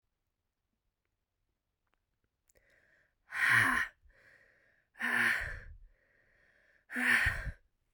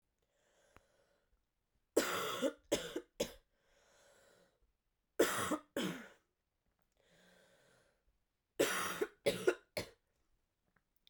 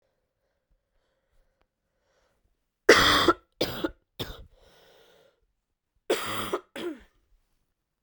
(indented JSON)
{
  "exhalation_length": "7.9 s",
  "exhalation_amplitude": 6359,
  "exhalation_signal_mean_std_ratio": 0.37,
  "three_cough_length": "11.1 s",
  "three_cough_amplitude": 4700,
  "three_cough_signal_mean_std_ratio": 0.33,
  "cough_length": "8.0 s",
  "cough_amplitude": 24154,
  "cough_signal_mean_std_ratio": 0.27,
  "survey_phase": "beta (2021-08-13 to 2022-03-07)",
  "age": "18-44",
  "gender": "Female",
  "wearing_mask": "No",
  "symptom_cough_any": true,
  "symptom_runny_or_blocked_nose": true,
  "symptom_sore_throat": true,
  "symptom_fatigue": true,
  "symptom_other": true,
  "symptom_onset": "5 days",
  "smoker_status": "Never smoked",
  "respiratory_condition_asthma": false,
  "respiratory_condition_other": false,
  "recruitment_source": "Test and Trace",
  "submission_delay": "1 day",
  "covid_test_result": "Positive",
  "covid_test_method": "ePCR"
}